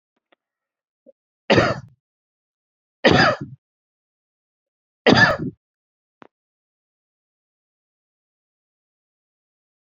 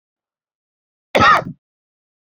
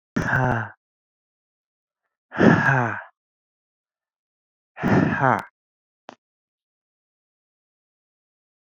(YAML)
three_cough_length: 9.8 s
three_cough_amplitude: 32609
three_cough_signal_mean_std_ratio: 0.24
cough_length: 2.3 s
cough_amplitude: 28169
cough_signal_mean_std_ratio: 0.29
exhalation_length: 8.7 s
exhalation_amplitude: 26841
exhalation_signal_mean_std_ratio: 0.33
survey_phase: beta (2021-08-13 to 2022-03-07)
age: 18-44
gender: Male
wearing_mask: 'Yes'
symptom_sore_throat: true
symptom_other: true
symptom_onset: 12 days
smoker_status: Never smoked
respiratory_condition_asthma: false
respiratory_condition_other: false
recruitment_source: REACT
submission_delay: 12 days
covid_test_result: Negative
covid_test_method: RT-qPCR
influenza_a_test_result: Negative
influenza_b_test_result: Negative